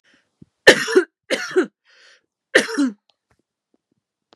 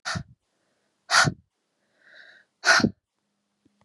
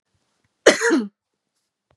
{
  "three_cough_length": "4.4 s",
  "three_cough_amplitude": 32768,
  "three_cough_signal_mean_std_ratio": 0.3,
  "exhalation_length": "3.8 s",
  "exhalation_amplitude": 18104,
  "exhalation_signal_mean_std_ratio": 0.29,
  "cough_length": "2.0 s",
  "cough_amplitude": 32767,
  "cough_signal_mean_std_ratio": 0.31,
  "survey_phase": "beta (2021-08-13 to 2022-03-07)",
  "age": "18-44",
  "gender": "Female",
  "wearing_mask": "No",
  "symptom_cough_any": true,
  "symptom_runny_or_blocked_nose": true,
  "symptom_fatigue": true,
  "symptom_headache": true,
  "symptom_change_to_sense_of_smell_or_taste": true,
  "symptom_loss_of_taste": true,
  "symptom_onset": "2 days",
  "smoker_status": "Never smoked",
  "respiratory_condition_asthma": false,
  "respiratory_condition_other": false,
  "recruitment_source": "Test and Trace",
  "submission_delay": "1 day",
  "covid_test_result": "Positive",
  "covid_test_method": "RT-qPCR",
  "covid_ct_value": 27.0,
  "covid_ct_gene": "ORF1ab gene",
  "covid_ct_mean": 27.6,
  "covid_viral_load": "870 copies/ml",
  "covid_viral_load_category": "Minimal viral load (< 10K copies/ml)"
}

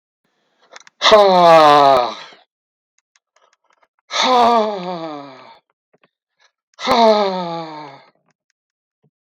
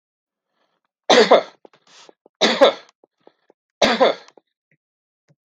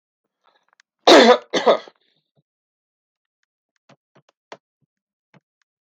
{
  "exhalation_length": "9.2 s",
  "exhalation_amplitude": 32768,
  "exhalation_signal_mean_std_ratio": 0.42,
  "three_cough_length": "5.5 s",
  "three_cough_amplitude": 32766,
  "three_cough_signal_mean_std_ratio": 0.31,
  "cough_length": "5.9 s",
  "cough_amplitude": 32768,
  "cough_signal_mean_std_ratio": 0.22,
  "survey_phase": "beta (2021-08-13 to 2022-03-07)",
  "age": "45-64",
  "gender": "Male",
  "wearing_mask": "No",
  "symptom_none": true,
  "smoker_status": "Ex-smoker",
  "respiratory_condition_asthma": false,
  "respiratory_condition_other": false,
  "recruitment_source": "REACT",
  "submission_delay": "2 days",
  "covid_test_result": "Negative",
  "covid_test_method": "RT-qPCR",
  "influenza_a_test_result": "Unknown/Void",
  "influenza_b_test_result": "Unknown/Void"
}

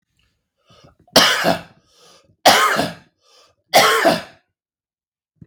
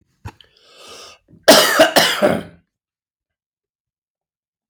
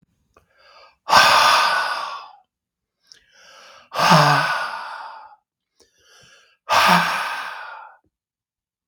{
  "three_cough_length": "5.5 s",
  "three_cough_amplitude": 32768,
  "three_cough_signal_mean_std_ratio": 0.39,
  "cough_length": "4.7 s",
  "cough_amplitude": 32768,
  "cough_signal_mean_std_ratio": 0.34,
  "exhalation_length": "8.9 s",
  "exhalation_amplitude": 32768,
  "exhalation_signal_mean_std_ratio": 0.44,
  "survey_phase": "beta (2021-08-13 to 2022-03-07)",
  "age": "45-64",
  "gender": "Male",
  "wearing_mask": "No",
  "symptom_cough_any": true,
  "symptom_onset": "9 days",
  "smoker_status": "Never smoked",
  "respiratory_condition_asthma": false,
  "respiratory_condition_other": false,
  "recruitment_source": "REACT",
  "submission_delay": "1 day",
  "covid_test_result": "Negative",
  "covid_test_method": "RT-qPCR"
}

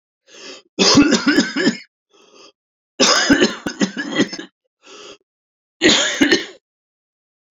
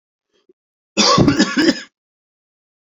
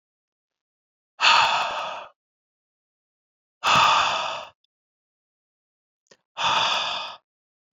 {
  "three_cough_length": "7.5 s",
  "three_cough_amplitude": 30280,
  "three_cough_signal_mean_std_ratio": 0.46,
  "cough_length": "2.8 s",
  "cough_amplitude": 29675,
  "cough_signal_mean_std_ratio": 0.42,
  "exhalation_length": "7.8 s",
  "exhalation_amplitude": 20472,
  "exhalation_signal_mean_std_ratio": 0.41,
  "survey_phase": "beta (2021-08-13 to 2022-03-07)",
  "age": "18-44",
  "gender": "Male",
  "wearing_mask": "No",
  "symptom_cough_any": true,
  "symptom_headache": true,
  "symptom_change_to_sense_of_smell_or_taste": true,
  "smoker_status": "Never smoked",
  "respiratory_condition_asthma": false,
  "respiratory_condition_other": false,
  "recruitment_source": "Test and Trace",
  "submission_delay": "2 days",
  "covid_test_result": "Positive",
  "covid_test_method": "RT-qPCR"
}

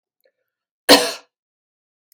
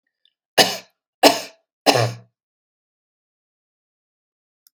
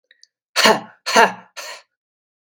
{
  "cough_length": "2.1 s",
  "cough_amplitude": 32768,
  "cough_signal_mean_std_ratio": 0.22,
  "three_cough_length": "4.7 s",
  "three_cough_amplitude": 32768,
  "three_cough_signal_mean_std_ratio": 0.24,
  "exhalation_length": "2.5 s",
  "exhalation_amplitude": 32767,
  "exhalation_signal_mean_std_ratio": 0.34,
  "survey_phase": "beta (2021-08-13 to 2022-03-07)",
  "age": "45-64",
  "gender": "Female",
  "wearing_mask": "No",
  "symptom_none": true,
  "smoker_status": "Never smoked",
  "respiratory_condition_asthma": false,
  "respiratory_condition_other": false,
  "recruitment_source": "REACT",
  "submission_delay": "0 days",
  "covid_test_result": "Negative",
  "covid_test_method": "RT-qPCR",
  "influenza_a_test_result": "Negative",
  "influenza_b_test_result": "Negative"
}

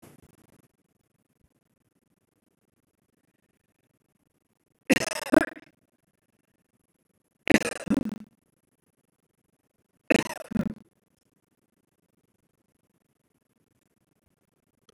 {
  "three_cough_length": "14.9 s",
  "three_cough_amplitude": 22697,
  "three_cough_signal_mean_std_ratio": 0.16,
  "survey_phase": "beta (2021-08-13 to 2022-03-07)",
  "age": "45-64",
  "gender": "Female",
  "wearing_mask": "No",
  "symptom_none": true,
  "smoker_status": "Never smoked",
  "respiratory_condition_asthma": false,
  "respiratory_condition_other": false,
  "recruitment_source": "REACT",
  "submission_delay": "2 days",
  "covid_test_result": "Negative",
  "covid_test_method": "RT-qPCR",
  "influenza_a_test_result": "Negative",
  "influenza_b_test_result": "Negative"
}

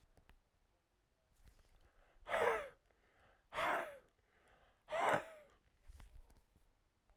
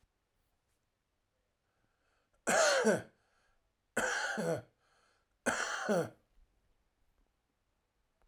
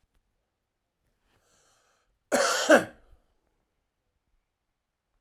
{
  "exhalation_length": "7.2 s",
  "exhalation_amplitude": 3220,
  "exhalation_signal_mean_std_ratio": 0.34,
  "three_cough_length": "8.3 s",
  "three_cough_amplitude": 5115,
  "three_cough_signal_mean_std_ratio": 0.36,
  "cough_length": "5.2 s",
  "cough_amplitude": 16000,
  "cough_signal_mean_std_ratio": 0.22,
  "survey_phase": "alpha (2021-03-01 to 2021-08-12)",
  "age": "18-44",
  "gender": "Male",
  "wearing_mask": "No",
  "symptom_none": true,
  "smoker_status": "Current smoker (11 or more cigarettes per day)",
  "respiratory_condition_asthma": false,
  "respiratory_condition_other": false,
  "recruitment_source": "REACT",
  "submission_delay": "1 day",
  "covid_test_result": "Negative",
  "covid_test_method": "RT-qPCR"
}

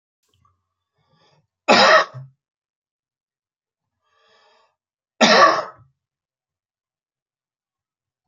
{
  "cough_length": "8.3 s",
  "cough_amplitude": 28939,
  "cough_signal_mean_std_ratio": 0.25,
  "survey_phase": "beta (2021-08-13 to 2022-03-07)",
  "age": "45-64",
  "gender": "Male",
  "wearing_mask": "No",
  "symptom_runny_or_blocked_nose": true,
  "symptom_onset": "12 days",
  "smoker_status": "Never smoked",
  "respiratory_condition_asthma": false,
  "respiratory_condition_other": false,
  "recruitment_source": "REACT",
  "submission_delay": "0 days",
  "covid_test_result": "Negative",
  "covid_test_method": "RT-qPCR",
  "influenza_a_test_result": "Negative",
  "influenza_b_test_result": "Negative"
}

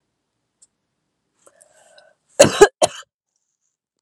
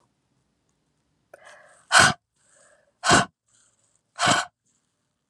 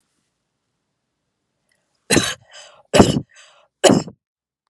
{
  "cough_length": "4.0 s",
  "cough_amplitude": 32768,
  "cough_signal_mean_std_ratio": 0.19,
  "exhalation_length": "5.3 s",
  "exhalation_amplitude": 28243,
  "exhalation_signal_mean_std_ratio": 0.27,
  "three_cough_length": "4.7 s",
  "three_cough_amplitude": 32768,
  "three_cough_signal_mean_std_ratio": 0.27,
  "survey_phase": "alpha (2021-03-01 to 2021-08-12)",
  "age": "18-44",
  "gender": "Female",
  "wearing_mask": "No",
  "symptom_none": true,
  "symptom_onset": "11 days",
  "smoker_status": "Ex-smoker",
  "respiratory_condition_asthma": false,
  "respiratory_condition_other": false,
  "recruitment_source": "REACT",
  "submission_delay": "1 day",
  "covid_test_result": "Negative",
  "covid_test_method": "RT-qPCR"
}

